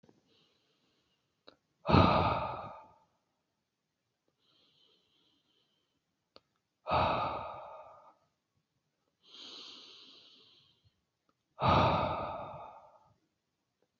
{"exhalation_length": "14.0 s", "exhalation_amplitude": 10235, "exhalation_signal_mean_std_ratio": 0.31, "survey_phase": "beta (2021-08-13 to 2022-03-07)", "age": "18-44", "gender": "Female", "wearing_mask": "No", "symptom_cough_any": true, "symptom_runny_or_blocked_nose": true, "symptom_sore_throat": true, "symptom_fatigue": true, "symptom_change_to_sense_of_smell_or_taste": true, "symptom_onset": "2 days", "smoker_status": "Current smoker (11 or more cigarettes per day)", "respiratory_condition_asthma": false, "respiratory_condition_other": false, "recruitment_source": "Test and Trace", "submission_delay": "1 day", "covid_test_result": "Positive", "covid_test_method": "RT-qPCR", "covid_ct_value": 13.9, "covid_ct_gene": "ORF1ab gene"}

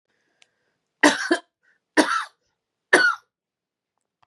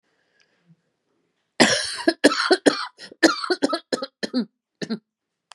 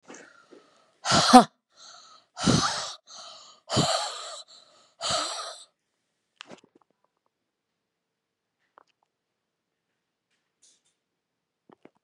{"three_cough_length": "4.3 s", "three_cough_amplitude": 29675, "three_cough_signal_mean_std_ratio": 0.31, "cough_length": "5.5 s", "cough_amplitude": 32767, "cough_signal_mean_std_ratio": 0.37, "exhalation_length": "12.0 s", "exhalation_amplitude": 32767, "exhalation_signal_mean_std_ratio": 0.24, "survey_phase": "beta (2021-08-13 to 2022-03-07)", "age": "18-44", "gender": "Female", "wearing_mask": "No", "symptom_cough_any": true, "symptom_runny_or_blocked_nose": true, "symptom_shortness_of_breath": true, "symptom_sore_throat": true, "symptom_change_to_sense_of_smell_or_taste": true, "symptom_loss_of_taste": true, "symptom_onset": "7 days", "smoker_status": "Ex-smoker", "respiratory_condition_asthma": false, "respiratory_condition_other": false, "recruitment_source": "Test and Trace", "submission_delay": "2 days", "covid_test_result": "Positive", "covid_test_method": "RT-qPCR", "covid_ct_value": 26.9, "covid_ct_gene": "N gene"}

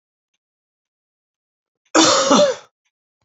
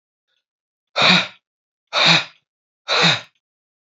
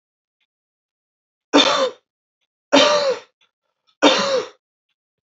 {"cough_length": "3.2 s", "cough_amplitude": 28218, "cough_signal_mean_std_ratio": 0.35, "exhalation_length": "3.8 s", "exhalation_amplitude": 31142, "exhalation_signal_mean_std_ratio": 0.39, "three_cough_length": "5.3 s", "three_cough_amplitude": 31276, "three_cough_signal_mean_std_ratio": 0.38, "survey_phase": "beta (2021-08-13 to 2022-03-07)", "age": "45-64", "gender": "Male", "wearing_mask": "No", "symptom_cough_any": true, "symptom_sore_throat": true, "symptom_fatigue": true, "symptom_headache": true, "symptom_loss_of_taste": true, "symptom_onset": "3 days", "smoker_status": "Never smoked", "respiratory_condition_asthma": false, "respiratory_condition_other": false, "recruitment_source": "Test and Trace", "submission_delay": "3 days", "covid_test_result": "Positive", "covid_test_method": "RT-qPCR"}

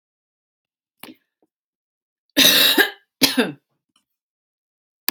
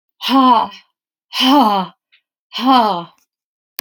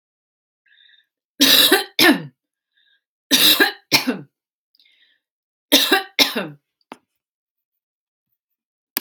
{"cough_length": "5.1 s", "cough_amplitude": 32768, "cough_signal_mean_std_ratio": 0.3, "exhalation_length": "3.8 s", "exhalation_amplitude": 32768, "exhalation_signal_mean_std_ratio": 0.51, "three_cough_length": "9.0 s", "three_cough_amplitude": 32768, "three_cough_signal_mean_std_ratio": 0.34, "survey_phase": "beta (2021-08-13 to 2022-03-07)", "age": "45-64", "gender": "Female", "wearing_mask": "No", "symptom_none": true, "smoker_status": "Never smoked", "respiratory_condition_asthma": false, "respiratory_condition_other": false, "recruitment_source": "REACT", "submission_delay": "2 days", "covid_test_result": "Negative", "covid_test_method": "RT-qPCR"}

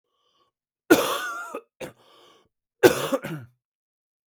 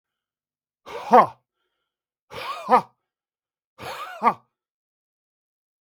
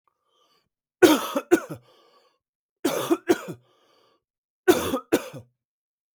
{"cough_length": "4.3 s", "cough_amplitude": 32766, "cough_signal_mean_std_ratio": 0.3, "exhalation_length": "5.8 s", "exhalation_amplitude": 32766, "exhalation_signal_mean_std_ratio": 0.24, "three_cough_length": "6.1 s", "three_cough_amplitude": 32766, "three_cough_signal_mean_std_ratio": 0.31, "survey_phase": "beta (2021-08-13 to 2022-03-07)", "age": "45-64", "gender": "Male", "wearing_mask": "No", "symptom_cough_any": true, "symptom_new_continuous_cough": true, "symptom_runny_or_blocked_nose": true, "symptom_sore_throat": true, "symptom_fatigue": true, "symptom_headache": true, "symptom_change_to_sense_of_smell_or_taste": true, "smoker_status": "Never smoked", "respiratory_condition_asthma": false, "respiratory_condition_other": false, "recruitment_source": "Test and Trace", "submission_delay": "1 day", "covid_test_result": "Positive", "covid_test_method": "LFT"}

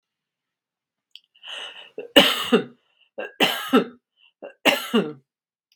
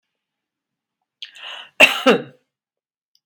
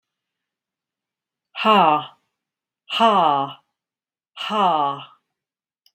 {"three_cough_length": "5.8 s", "three_cough_amplitude": 32768, "three_cough_signal_mean_std_ratio": 0.34, "cough_length": "3.3 s", "cough_amplitude": 32768, "cough_signal_mean_std_ratio": 0.24, "exhalation_length": "5.9 s", "exhalation_amplitude": 21743, "exhalation_signal_mean_std_ratio": 0.4, "survey_phase": "beta (2021-08-13 to 2022-03-07)", "age": "45-64", "gender": "Female", "wearing_mask": "No", "symptom_none": true, "smoker_status": "Never smoked", "respiratory_condition_asthma": false, "respiratory_condition_other": false, "recruitment_source": "REACT", "submission_delay": "0 days", "covid_test_result": "Negative", "covid_test_method": "RT-qPCR"}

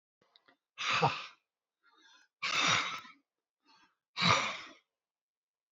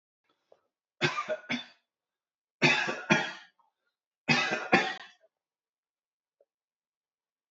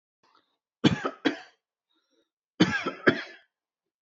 {"exhalation_length": "5.7 s", "exhalation_amplitude": 7195, "exhalation_signal_mean_std_ratio": 0.38, "three_cough_length": "7.5 s", "three_cough_amplitude": 12918, "three_cough_signal_mean_std_ratio": 0.34, "cough_length": "4.0 s", "cough_amplitude": 22853, "cough_signal_mean_std_ratio": 0.29, "survey_phase": "beta (2021-08-13 to 2022-03-07)", "age": "45-64", "gender": "Male", "wearing_mask": "No", "symptom_none": true, "smoker_status": "Ex-smoker", "respiratory_condition_asthma": false, "respiratory_condition_other": false, "recruitment_source": "REACT", "submission_delay": "2 days", "covid_test_result": "Negative", "covid_test_method": "RT-qPCR", "influenza_a_test_result": "Negative", "influenza_b_test_result": "Negative"}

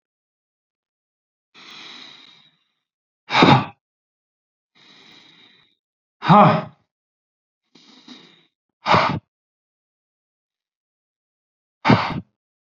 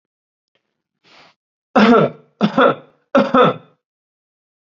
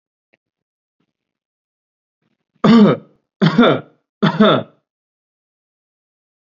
{"exhalation_length": "12.7 s", "exhalation_amplitude": 32767, "exhalation_signal_mean_std_ratio": 0.25, "three_cough_length": "4.7 s", "three_cough_amplitude": 29330, "three_cough_signal_mean_std_ratio": 0.37, "cough_length": "6.5 s", "cough_amplitude": 29895, "cough_signal_mean_std_ratio": 0.32, "survey_phase": "beta (2021-08-13 to 2022-03-07)", "age": "18-44", "gender": "Male", "wearing_mask": "No", "symptom_none": true, "smoker_status": "Never smoked", "respiratory_condition_asthma": false, "respiratory_condition_other": false, "recruitment_source": "REACT", "submission_delay": "1 day", "covid_test_result": "Negative", "covid_test_method": "RT-qPCR", "influenza_a_test_result": "Negative", "influenza_b_test_result": "Negative"}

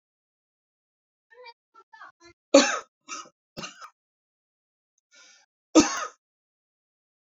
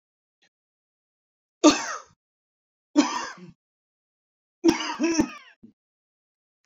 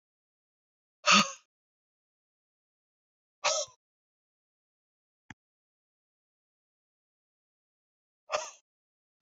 {"cough_length": "7.3 s", "cough_amplitude": 29418, "cough_signal_mean_std_ratio": 0.19, "three_cough_length": "6.7 s", "three_cough_amplitude": 23933, "three_cough_signal_mean_std_ratio": 0.28, "exhalation_length": "9.2 s", "exhalation_amplitude": 12298, "exhalation_signal_mean_std_ratio": 0.17, "survey_phase": "beta (2021-08-13 to 2022-03-07)", "age": "45-64", "gender": "Male", "wearing_mask": "No", "symptom_shortness_of_breath": true, "symptom_sore_throat": true, "symptom_fatigue": true, "symptom_headache": true, "symptom_onset": "12 days", "smoker_status": "Ex-smoker", "respiratory_condition_asthma": false, "respiratory_condition_other": false, "recruitment_source": "REACT", "submission_delay": "6 days", "covid_test_result": "Negative", "covid_test_method": "RT-qPCR"}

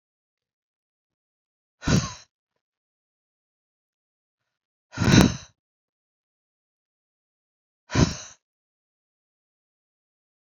{"exhalation_length": "10.6 s", "exhalation_amplitude": 25775, "exhalation_signal_mean_std_ratio": 0.19, "survey_phase": "beta (2021-08-13 to 2022-03-07)", "age": "45-64", "gender": "Female", "wearing_mask": "No", "symptom_none": true, "symptom_onset": "4 days", "smoker_status": "Never smoked", "respiratory_condition_asthma": false, "respiratory_condition_other": false, "recruitment_source": "REACT", "submission_delay": "0 days", "covid_test_result": "Negative", "covid_test_method": "RT-qPCR", "influenza_a_test_result": "Negative", "influenza_b_test_result": "Negative"}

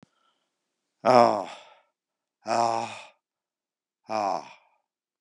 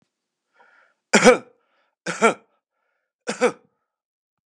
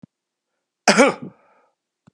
{"exhalation_length": "5.2 s", "exhalation_amplitude": 24212, "exhalation_signal_mean_std_ratio": 0.3, "three_cough_length": "4.5 s", "three_cough_amplitude": 32767, "three_cough_signal_mean_std_ratio": 0.24, "cough_length": "2.1 s", "cough_amplitude": 32735, "cough_signal_mean_std_ratio": 0.26, "survey_phase": "beta (2021-08-13 to 2022-03-07)", "age": "65+", "gender": "Male", "wearing_mask": "No", "symptom_runny_or_blocked_nose": true, "smoker_status": "Ex-smoker", "respiratory_condition_asthma": false, "respiratory_condition_other": true, "recruitment_source": "REACT", "submission_delay": "2 days", "covid_test_result": "Negative", "covid_test_method": "RT-qPCR", "influenza_a_test_result": "Negative", "influenza_b_test_result": "Negative"}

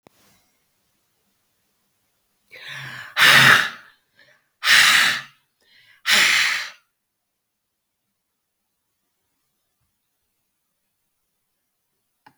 {"exhalation_length": "12.4 s", "exhalation_amplitude": 32768, "exhalation_signal_mean_std_ratio": 0.29, "survey_phase": "beta (2021-08-13 to 2022-03-07)", "age": "45-64", "gender": "Female", "wearing_mask": "No", "symptom_cough_any": true, "symptom_runny_or_blocked_nose": true, "symptom_onset": "3 days", "smoker_status": "Current smoker (1 to 10 cigarettes per day)", "respiratory_condition_asthma": false, "respiratory_condition_other": false, "recruitment_source": "REACT", "submission_delay": "13 days", "covid_test_result": "Negative", "covid_test_method": "RT-qPCR"}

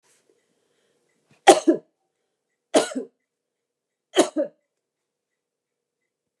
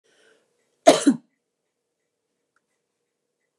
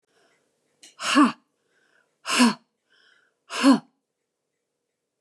{"three_cough_length": "6.4 s", "three_cough_amplitude": 32768, "three_cough_signal_mean_std_ratio": 0.21, "cough_length": "3.6 s", "cough_amplitude": 31504, "cough_signal_mean_std_ratio": 0.18, "exhalation_length": "5.2 s", "exhalation_amplitude": 17207, "exhalation_signal_mean_std_ratio": 0.29, "survey_phase": "beta (2021-08-13 to 2022-03-07)", "age": "45-64", "gender": "Female", "wearing_mask": "No", "symptom_none": true, "smoker_status": "Never smoked", "respiratory_condition_asthma": false, "respiratory_condition_other": false, "recruitment_source": "REACT", "submission_delay": "3 days", "covid_test_result": "Negative", "covid_test_method": "RT-qPCR", "influenza_a_test_result": "Negative", "influenza_b_test_result": "Negative"}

